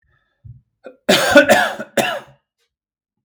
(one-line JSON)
{"cough_length": "3.2 s", "cough_amplitude": 32768, "cough_signal_mean_std_ratio": 0.39, "survey_phase": "beta (2021-08-13 to 2022-03-07)", "age": "18-44", "gender": "Male", "wearing_mask": "No", "symptom_shortness_of_breath": true, "symptom_fatigue": true, "symptom_change_to_sense_of_smell_or_taste": true, "symptom_onset": "3 days", "smoker_status": "Ex-smoker", "respiratory_condition_asthma": false, "respiratory_condition_other": false, "recruitment_source": "Test and Trace", "submission_delay": "2 days", "covid_test_result": "Positive", "covid_test_method": "RT-qPCR", "covid_ct_value": 29.8, "covid_ct_gene": "N gene"}